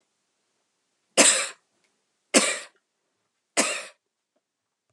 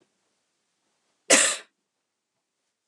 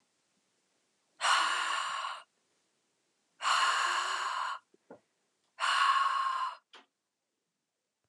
three_cough_length: 4.9 s
three_cough_amplitude: 32637
three_cough_signal_mean_std_ratio: 0.28
cough_length: 2.9 s
cough_amplitude: 25956
cough_signal_mean_std_ratio: 0.22
exhalation_length: 8.1 s
exhalation_amplitude: 6767
exhalation_signal_mean_std_ratio: 0.52
survey_phase: beta (2021-08-13 to 2022-03-07)
age: 45-64
gender: Female
wearing_mask: 'No'
symptom_cough_any: true
symptom_runny_or_blocked_nose: true
smoker_status: Ex-smoker
respiratory_condition_asthma: false
respiratory_condition_other: false
recruitment_source: REACT
submission_delay: 4 days
covid_test_result: Negative
covid_test_method: RT-qPCR
influenza_a_test_result: Negative
influenza_b_test_result: Negative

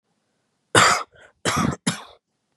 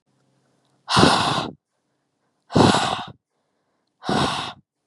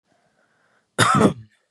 three_cough_length: 2.6 s
three_cough_amplitude: 31857
three_cough_signal_mean_std_ratio: 0.38
exhalation_length: 4.9 s
exhalation_amplitude: 29503
exhalation_signal_mean_std_ratio: 0.42
cough_length: 1.7 s
cough_amplitude: 25856
cough_signal_mean_std_ratio: 0.37
survey_phase: beta (2021-08-13 to 2022-03-07)
age: 18-44
gender: Male
wearing_mask: 'No'
symptom_cough_any: true
symptom_runny_or_blocked_nose: true
symptom_sore_throat: true
symptom_onset: 4 days
smoker_status: Ex-smoker
respiratory_condition_asthma: false
respiratory_condition_other: false
recruitment_source: REACT
submission_delay: 1 day
covid_test_result: Negative
covid_test_method: RT-qPCR
influenza_a_test_result: Negative
influenza_b_test_result: Negative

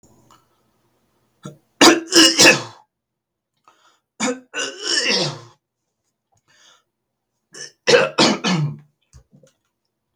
three_cough_length: 10.2 s
three_cough_amplitude: 32768
three_cough_signal_mean_std_ratio: 0.34
survey_phase: beta (2021-08-13 to 2022-03-07)
age: 18-44
gender: Male
wearing_mask: 'No'
symptom_cough_any: true
symptom_new_continuous_cough: true
symptom_runny_or_blocked_nose: true
symptom_sore_throat: true
symptom_fatigue: true
symptom_fever_high_temperature: true
symptom_headache: true
smoker_status: Never smoked
respiratory_condition_asthma: false
respiratory_condition_other: false
recruitment_source: REACT
submission_delay: 3 days
covid_test_result: Negative
covid_test_method: RT-qPCR
influenza_a_test_result: Negative
influenza_b_test_result: Negative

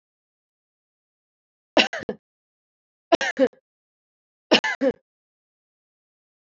three_cough_length: 6.5 s
three_cough_amplitude: 30644
three_cough_signal_mean_std_ratio: 0.23
survey_phase: alpha (2021-03-01 to 2021-08-12)
age: 45-64
gender: Female
wearing_mask: 'No'
symptom_shortness_of_breath: true
smoker_status: Never smoked
respiratory_condition_asthma: false
respiratory_condition_other: false
recruitment_source: Test and Trace
submission_delay: 1 day
covid_test_result: Positive
covid_test_method: RT-qPCR
covid_ct_value: 24.6
covid_ct_gene: ORF1ab gene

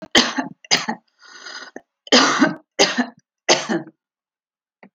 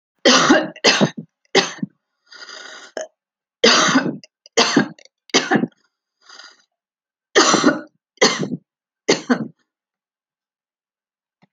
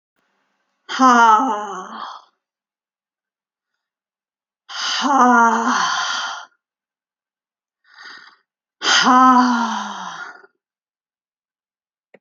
cough_length: 4.9 s
cough_amplitude: 32767
cough_signal_mean_std_ratio: 0.41
three_cough_length: 11.5 s
three_cough_amplitude: 32768
three_cough_signal_mean_std_ratio: 0.39
exhalation_length: 12.2 s
exhalation_amplitude: 30339
exhalation_signal_mean_std_ratio: 0.42
survey_phase: alpha (2021-03-01 to 2021-08-12)
age: 65+
gender: Female
wearing_mask: 'No'
symptom_none: true
smoker_status: Ex-smoker
respiratory_condition_asthma: false
respiratory_condition_other: false
recruitment_source: REACT
submission_delay: 0 days
covid_test_result: Negative
covid_test_method: RT-qPCR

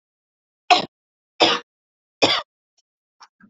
three_cough_length: 3.5 s
three_cough_amplitude: 28444
three_cough_signal_mean_std_ratio: 0.27
survey_phase: beta (2021-08-13 to 2022-03-07)
age: 18-44
gender: Female
wearing_mask: 'No'
symptom_none: true
smoker_status: Never smoked
respiratory_condition_asthma: false
respiratory_condition_other: false
recruitment_source: REACT
submission_delay: 2 days
covid_test_result: Negative
covid_test_method: RT-qPCR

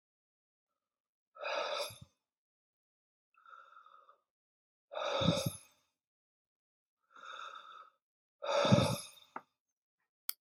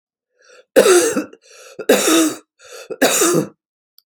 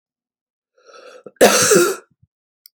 exhalation_length: 10.4 s
exhalation_amplitude: 6921
exhalation_signal_mean_std_ratio: 0.31
three_cough_length: 4.1 s
three_cough_amplitude: 30350
three_cough_signal_mean_std_ratio: 0.5
cough_length: 2.8 s
cough_amplitude: 31888
cough_signal_mean_std_ratio: 0.36
survey_phase: beta (2021-08-13 to 2022-03-07)
age: 45-64
gender: Female
wearing_mask: 'No'
symptom_runny_or_blocked_nose: true
symptom_sore_throat: true
symptom_fatigue: true
symptom_headache: true
symptom_onset: 2 days
smoker_status: Ex-smoker
respiratory_condition_asthma: false
respiratory_condition_other: false
recruitment_source: Test and Trace
submission_delay: 1 day
covid_test_result: Positive
covid_test_method: RT-qPCR
covid_ct_value: 23.4
covid_ct_gene: ORF1ab gene
covid_ct_mean: 24.2
covid_viral_load: 12000 copies/ml
covid_viral_load_category: Low viral load (10K-1M copies/ml)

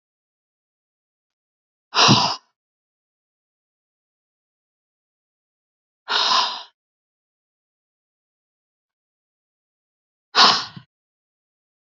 exhalation_length: 11.9 s
exhalation_amplitude: 32768
exhalation_signal_mean_std_ratio: 0.23
survey_phase: beta (2021-08-13 to 2022-03-07)
age: 45-64
gender: Female
wearing_mask: 'No'
symptom_abdominal_pain: true
symptom_fatigue: true
symptom_headache: true
symptom_onset: 8 days
smoker_status: Ex-smoker
respiratory_condition_asthma: false
respiratory_condition_other: false
recruitment_source: REACT
submission_delay: 1 day
covid_test_result: Negative
covid_test_method: RT-qPCR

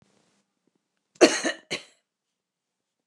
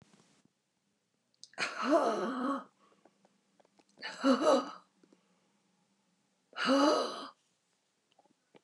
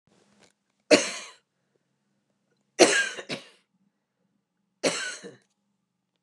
cough_length: 3.1 s
cough_amplitude: 26800
cough_signal_mean_std_ratio: 0.21
exhalation_length: 8.6 s
exhalation_amplitude: 6537
exhalation_signal_mean_std_ratio: 0.38
three_cough_length: 6.2 s
three_cough_amplitude: 29016
three_cough_signal_mean_std_ratio: 0.25
survey_phase: beta (2021-08-13 to 2022-03-07)
age: 65+
gender: Female
wearing_mask: 'No'
symptom_runny_or_blocked_nose: true
symptom_shortness_of_breath: true
smoker_status: Ex-smoker
respiratory_condition_asthma: false
respiratory_condition_other: false
recruitment_source: REACT
submission_delay: 2 days
covid_test_result: Negative
covid_test_method: RT-qPCR
influenza_a_test_result: Negative
influenza_b_test_result: Negative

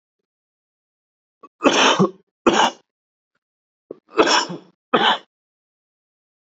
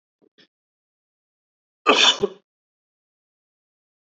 three_cough_length: 6.6 s
three_cough_amplitude: 28204
three_cough_signal_mean_std_ratio: 0.34
cough_length: 4.2 s
cough_amplitude: 27326
cough_signal_mean_std_ratio: 0.22
survey_phase: beta (2021-08-13 to 2022-03-07)
age: 18-44
gender: Male
wearing_mask: 'No'
symptom_none: true
smoker_status: Never smoked
respiratory_condition_asthma: true
respiratory_condition_other: false
recruitment_source: REACT
submission_delay: 3 days
covid_test_result: Negative
covid_test_method: RT-qPCR
influenza_a_test_result: Negative
influenza_b_test_result: Negative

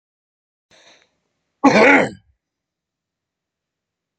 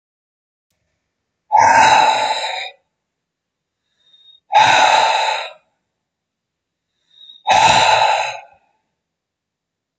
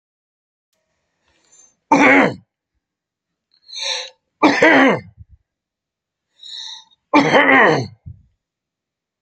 cough_length: 4.2 s
cough_amplitude: 28331
cough_signal_mean_std_ratio: 0.26
exhalation_length: 10.0 s
exhalation_amplitude: 32768
exhalation_signal_mean_std_ratio: 0.44
three_cough_length: 9.2 s
three_cough_amplitude: 32767
three_cough_signal_mean_std_ratio: 0.37
survey_phase: beta (2021-08-13 to 2022-03-07)
age: 65+
gender: Male
wearing_mask: 'No'
symptom_none: true
smoker_status: Ex-smoker
respiratory_condition_asthma: true
respiratory_condition_other: false
recruitment_source: REACT
submission_delay: 2 days
covid_test_result: Negative
covid_test_method: RT-qPCR
influenza_a_test_result: Negative
influenza_b_test_result: Negative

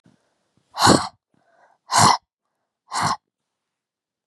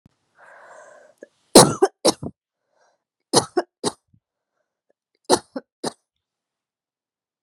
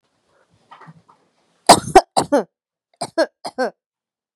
exhalation_length: 4.3 s
exhalation_amplitude: 29895
exhalation_signal_mean_std_ratio: 0.31
three_cough_length: 7.4 s
three_cough_amplitude: 32768
three_cough_signal_mean_std_ratio: 0.21
cough_length: 4.4 s
cough_amplitude: 32768
cough_signal_mean_std_ratio: 0.25
survey_phase: beta (2021-08-13 to 2022-03-07)
age: 18-44
gender: Female
wearing_mask: 'No'
symptom_runny_or_blocked_nose: true
symptom_sore_throat: true
symptom_fatigue: true
symptom_headache: true
smoker_status: Never smoked
respiratory_condition_asthma: false
respiratory_condition_other: false
recruitment_source: Test and Trace
submission_delay: 4 days
covid_test_result: Positive
covid_test_method: RT-qPCR
covid_ct_value: 24.7
covid_ct_gene: ORF1ab gene
covid_ct_mean: 25.0
covid_viral_load: 6500 copies/ml
covid_viral_load_category: Minimal viral load (< 10K copies/ml)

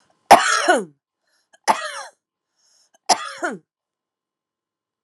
three_cough_length: 5.0 s
three_cough_amplitude: 32768
three_cough_signal_mean_std_ratio: 0.28
survey_phase: alpha (2021-03-01 to 2021-08-12)
age: 45-64
gender: Female
wearing_mask: 'No'
symptom_cough_any: true
symptom_headache: true
symptom_onset: 6 days
smoker_status: Ex-smoker
respiratory_condition_asthma: true
respiratory_condition_other: false
recruitment_source: Test and Trace
submission_delay: 2 days
covid_test_result: Positive
covid_test_method: RT-qPCR
covid_ct_value: 15.0
covid_ct_gene: N gene
covid_ct_mean: 15.0
covid_viral_load: 12000000 copies/ml
covid_viral_load_category: High viral load (>1M copies/ml)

